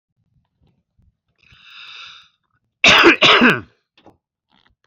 {"cough_length": "4.9 s", "cough_amplitude": 31236, "cough_signal_mean_std_ratio": 0.32, "survey_phase": "beta (2021-08-13 to 2022-03-07)", "age": "45-64", "gender": "Male", "wearing_mask": "No", "symptom_cough_any": true, "symptom_new_continuous_cough": true, "symptom_sore_throat": true, "symptom_onset": "11 days", "smoker_status": "Never smoked", "respiratory_condition_asthma": false, "respiratory_condition_other": false, "recruitment_source": "REACT", "submission_delay": "1 day", "covid_test_result": "Negative", "covid_test_method": "RT-qPCR", "covid_ct_value": 38.0, "covid_ct_gene": "E gene"}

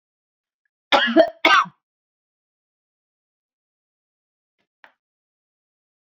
{"cough_length": "6.1 s", "cough_amplitude": 27685, "cough_signal_mean_std_ratio": 0.22, "survey_phase": "beta (2021-08-13 to 2022-03-07)", "age": "65+", "gender": "Female", "wearing_mask": "No", "symptom_none": true, "smoker_status": "Never smoked", "respiratory_condition_asthma": false, "respiratory_condition_other": false, "recruitment_source": "REACT", "submission_delay": "2 days", "covid_test_result": "Negative", "covid_test_method": "RT-qPCR"}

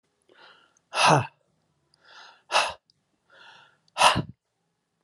{"exhalation_length": "5.0 s", "exhalation_amplitude": 20948, "exhalation_signal_mean_std_ratio": 0.3, "survey_phase": "alpha (2021-03-01 to 2021-08-12)", "age": "45-64", "gender": "Male", "wearing_mask": "No", "symptom_none": true, "smoker_status": "Ex-smoker", "respiratory_condition_asthma": false, "respiratory_condition_other": false, "recruitment_source": "REACT", "submission_delay": "1 day", "covid_test_result": "Negative", "covid_test_method": "RT-qPCR"}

